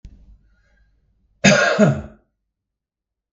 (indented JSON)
{
  "cough_length": "3.3 s",
  "cough_amplitude": 32768,
  "cough_signal_mean_std_ratio": 0.33,
  "survey_phase": "beta (2021-08-13 to 2022-03-07)",
  "age": "65+",
  "gender": "Male",
  "wearing_mask": "No",
  "symptom_headache": true,
  "symptom_onset": "7 days",
  "smoker_status": "Ex-smoker",
  "respiratory_condition_asthma": false,
  "respiratory_condition_other": false,
  "recruitment_source": "REACT",
  "submission_delay": "1 day",
  "covid_test_result": "Negative",
  "covid_test_method": "RT-qPCR",
  "influenza_a_test_result": "Negative",
  "influenza_b_test_result": "Negative"
}